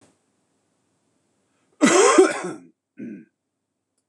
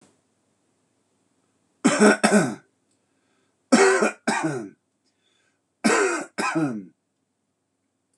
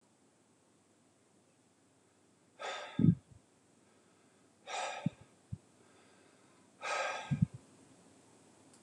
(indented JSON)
{
  "cough_length": "4.1 s",
  "cough_amplitude": 25341,
  "cough_signal_mean_std_ratio": 0.32,
  "three_cough_length": "8.2 s",
  "three_cough_amplitude": 23321,
  "three_cough_signal_mean_std_ratio": 0.39,
  "exhalation_length": "8.8 s",
  "exhalation_amplitude": 6392,
  "exhalation_signal_mean_std_ratio": 0.28,
  "survey_phase": "beta (2021-08-13 to 2022-03-07)",
  "age": "45-64",
  "gender": "Male",
  "wearing_mask": "No",
  "symptom_fatigue": true,
  "symptom_fever_high_temperature": true,
  "symptom_headache": true,
  "symptom_other": true,
  "smoker_status": "Never smoked",
  "respiratory_condition_asthma": false,
  "respiratory_condition_other": false,
  "recruitment_source": "Test and Trace",
  "submission_delay": "1 day",
  "covid_test_result": "Positive",
  "covid_test_method": "RT-qPCR",
  "covid_ct_value": 28.6,
  "covid_ct_gene": "N gene"
}